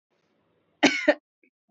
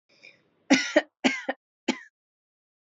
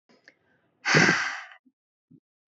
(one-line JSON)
{"cough_length": "1.7 s", "cough_amplitude": 18121, "cough_signal_mean_std_ratio": 0.27, "three_cough_length": "2.9 s", "three_cough_amplitude": 17631, "three_cough_signal_mean_std_ratio": 0.29, "exhalation_length": "2.5 s", "exhalation_amplitude": 15590, "exhalation_signal_mean_std_ratio": 0.35, "survey_phase": "beta (2021-08-13 to 2022-03-07)", "age": "18-44", "gender": "Female", "wearing_mask": "No", "symptom_none": true, "smoker_status": "Never smoked", "respiratory_condition_asthma": false, "respiratory_condition_other": false, "recruitment_source": "REACT", "submission_delay": "2 days", "covid_test_result": "Negative", "covid_test_method": "RT-qPCR", "influenza_a_test_result": "Negative", "influenza_b_test_result": "Negative"}